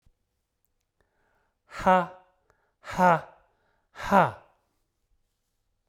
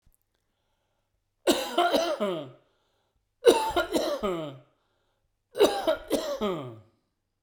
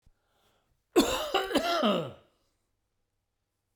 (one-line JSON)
{"exhalation_length": "5.9 s", "exhalation_amplitude": 17734, "exhalation_signal_mean_std_ratio": 0.27, "three_cough_length": "7.4 s", "three_cough_amplitude": 19212, "three_cough_signal_mean_std_ratio": 0.46, "cough_length": "3.8 s", "cough_amplitude": 10222, "cough_signal_mean_std_ratio": 0.41, "survey_phase": "beta (2021-08-13 to 2022-03-07)", "age": "65+", "gender": "Male", "wearing_mask": "No", "symptom_fever_high_temperature": true, "symptom_headache": true, "symptom_change_to_sense_of_smell_or_taste": true, "symptom_onset": "3 days", "smoker_status": "Never smoked", "respiratory_condition_asthma": false, "respiratory_condition_other": false, "recruitment_source": "Test and Trace", "submission_delay": "2 days", "covid_test_result": "Positive", "covid_test_method": "RT-qPCR", "covid_ct_value": 18.6, "covid_ct_gene": "ORF1ab gene"}